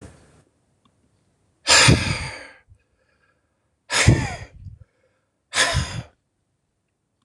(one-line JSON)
{"exhalation_length": "7.2 s", "exhalation_amplitude": 26027, "exhalation_signal_mean_std_ratio": 0.33, "survey_phase": "beta (2021-08-13 to 2022-03-07)", "age": "65+", "gender": "Male", "wearing_mask": "No", "symptom_none": true, "smoker_status": "Never smoked", "respiratory_condition_asthma": true, "respiratory_condition_other": false, "recruitment_source": "REACT", "submission_delay": "2 days", "covid_test_result": "Negative", "covid_test_method": "RT-qPCR"}